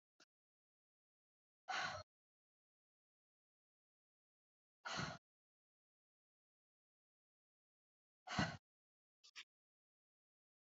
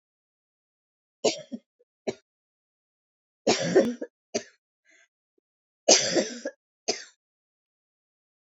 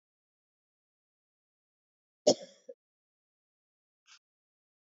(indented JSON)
{
  "exhalation_length": "10.8 s",
  "exhalation_amplitude": 1770,
  "exhalation_signal_mean_std_ratio": 0.22,
  "three_cough_length": "8.4 s",
  "three_cough_amplitude": 22559,
  "three_cough_signal_mean_std_ratio": 0.27,
  "cough_length": "4.9 s",
  "cough_amplitude": 9560,
  "cough_signal_mean_std_ratio": 0.1,
  "survey_phase": "beta (2021-08-13 to 2022-03-07)",
  "age": "45-64",
  "gender": "Female",
  "wearing_mask": "No",
  "symptom_cough_any": true,
  "symptom_runny_or_blocked_nose": true,
  "symptom_shortness_of_breath": true,
  "symptom_sore_throat": true,
  "symptom_abdominal_pain": true,
  "symptom_fatigue": true,
  "symptom_headache": true,
  "symptom_change_to_sense_of_smell_or_taste": true,
  "symptom_loss_of_taste": true,
  "symptom_other": true,
  "symptom_onset": "8 days",
  "smoker_status": "Never smoked",
  "respiratory_condition_asthma": false,
  "respiratory_condition_other": false,
  "recruitment_source": "Test and Trace",
  "submission_delay": "2 days",
  "covid_test_result": "Positive",
  "covid_test_method": "RT-qPCR",
  "covid_ct_value": 18.3,
  "covid_ct_gene": "ORF1ab gene",
  "covid_ct_mean": 18.5,
  "covid_viral_load": "870000 copies/ml",
  "covid_viral_load_category": "Low viral load (10K-1M copies/ml)"
}